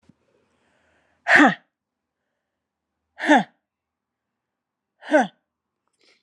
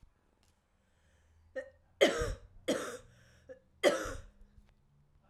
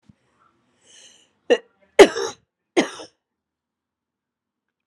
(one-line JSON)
{"exhalation_length": "6.2 s", "exhalation_amplitude": 28740, "exhalation_signal_mean_std_ratio": 0.24, "three_cough_length": "5.3 s", "three_cough_amplitude": 9348, "three_cough_signal_mean_std_ratio": 0.32, "cough_length": "4.9 s", "cough_amplitude": 32768, "cough_signal_mean_std_ratio": 0.18, "survey_phase": "alpha (2021-03-01 to 2021-08-12)", "age": "45-64", "gender": "Female", "wearing_mask": "No", "symptom_cough_any": true, "symptom_new_continuous_cough": true, "symptom_headache": true, "symptom_change_to_sense_of_smell_or_taste": true, "symptom_loss_of_taste": true, "symptom_onset": "3 days", "smoker_status": "Never smoked", "respiratory_condition_asthma": false, "respiratory_condition_other": false, "recruitment_source": "Test and Trace", "submission_delay": "1 day", "covid_test_result": "Positive", "covid_test_method": "RT-qPCR", "covid_ct_value": 29.1, "covid_ct_gene": "ORF1ab gene", "covid_ct_mean": 29.5, "covid_viral_load": "210 copies/ml", "covid_viral_load_category": "Minimal viral load (< 10K copies/ml)"}